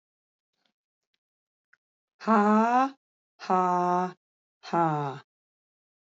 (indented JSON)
{
  "exhalation_length": "6.1 s",
  "exhalation_amplitude": 11036,
  "exhalation_signal_mean_std_ratio": 0.41,
  "survey_phase": "alpha (2021-03-01 to 2021-08-12)",
  "age": "45-64",
  "gender": "Female",
  "wearing_mask": "No",
  "symptom_fatigue": true,
  "symptom_fever_high_temperature": true,
  "symptom_headache": true,
  "symptom_change_to_sense_of_smell_or_taste": true,
  "symptom_onset": "3 days",
  "smoker_status": "Never smoked",
  "respiratory_condition_asthma": false,
  "respiratory_condition_other": false,
  "recruitment_source": "Test and Trace",
  "submission_delay": "2 days",
  "covid_test_result": "Positive",
  "covid_test_method": "RT-qPCR",
  "covid_ct_value": 18.1,
  "covid_ct_gene": "ORF1ab gene",
  "covid_ct_mean": 18.1,
  "covid_viral_load": "1100000 copies/ml",
  "covid_viral_load_category": "High viral load (>1M copies/ml)"
}